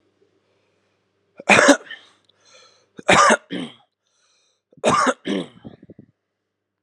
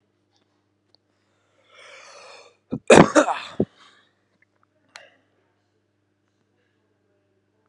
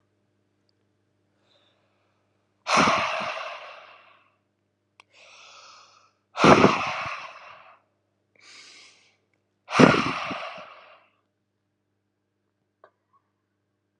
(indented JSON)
{
  "three_cough_length": "6.8 s",
  "three_cough_amplitude": 32768,
  "three_cough_signal_mean_std_ratio": 0.32,
  "cough_length": "7.7 s",
  "cough_amplitude": 32768,
  "cough_signal_mean_std_ratio": 0.18,
  "exhalation_length": "14.0 s",
  "exhalation_amplitude": 31975,
  "exhalation_signal_mean_std_ratio": 0.27,
  "survey_phase": "alpha (2021-03-01 to 2021-08-12)",
  "age": "18-44",
  "gender": "Male",
  "wearing_mask": "No",
  "symptom_none": true,
  "symptom_cough_any": true,
  "smoker_status": "Current smoker (11 or more cigarettes per day)",
  "respiratory_condition_asthma": false,
  "respiratory_condition_other": false,
  "recruitment_source": "Test and Trace",
  "submission_delay": "1 day",
  "covid_test_result": "Positive",
  "covid_test_method": "RT-qPCR",
  "covid_ct_value": 34.1,
  "covid_ct_gene": "ORF1ab gene",
  "covid_ct_mean": 34.4,
  "covid_viral_load": "5.1 copies/ml",
  "covid_viral_load_category": "Minimal viral load (< 10K copies/ml)"
}